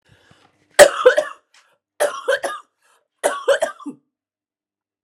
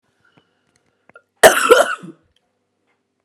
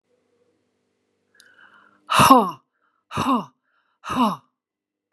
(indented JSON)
{
  "three_cough_length": "5.0 s",
  "three_cough_amplitude": 32768,
  "three_cough_signal_mean_std_ratio": 0.31,
  "cough_length": "3.2 s",
  "cough_amplitude": 32768,
  "cough_signal_mean_std_ratio": 0.27,
  "exhalation_length": "5.1 s",
  "exhalation_amplitude": 32599,
  "exhalation_signal_mean_std_ratio": 0.31,
  "survey_phase": "beta (2021-08-13 to 2022-03-07)",
  "age": "45-64",
  "gender": "Female",
  "wearing_mask": "No",
  "symptom_cough_any": true,
  "symptom_runny_or_blocked_nose": true,
  "symptom_fatigue": true,
  "symptom_fever_high_temperature": true,
  "symptom_headache": true,
  "smoker_status": "Never smoked",
  "respiratory_condition_asthma": false,
  "respiratory_condition_other": false,
  "recruitment_source": "Test and Trace",
  "submission_delay": "1 day",
  "covid_test_result": "Positive",
  "covid_test_method": "RT-qPCR"
}